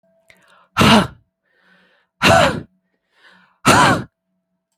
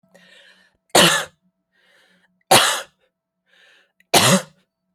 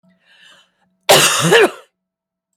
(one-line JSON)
{"exhalation_length": "4.8 s", "exhalation_amplitude": 32497, "exhalation_signal_mean_std_ratio": 0.38, "three_cough_length": "4.9 s", "three_cough_amplitude": 32767, "three_cough_signal_mean_std_ratio": 0.32, "cough_length": "2.6 s", "cough_amplitude": 32767, "cough_signal_mean_std_ratio": 0.4, "survey_phase": "alpha (2021-03-01 to 2021-08-12)", "age": "18-44", "gender": "Female", "wearing_mask": "No", "symptom_none": true, "smoker_status": "Ex-smoker", "respiratory_condition_asthma": false, "respiratory_condition_other": false, "recruitment_source": "REACT", "submission_delay": "1 day", "covid_test_result": "Negative", "covid_test_method": "RT-qPCR"}